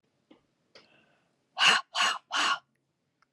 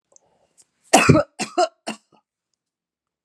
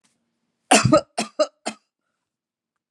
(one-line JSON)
{"exhalation_length": "3.3 s", "exhalation_amplitude": 13017, "exhalation_signal_mean_std_ratio": 0.36, "three_cough_length": "3.2 s", "three_cough_amplitude": 32767, "three_cough_signal_mean_std_ratio": 0.29, "cough_length": "2.9 s", "cough_amplitude": 30582, "cough_signal_mean_std_ratio": 0.29, "survey_phase": "alpha (2021-03-01 to 2021-08-12)", "age": "65+", "gender": "Female", "wearing_mask": "No", "symptom_none": true, "smoker_status": "Never smoked", "respiratory_condition_asthma": false, "respiratory_condition_other": false, "recruitment_source": "REACT", "submission_delay": "1 day", "covid_test_result": "Negative", "covid_test_method": "RT-qPCR"}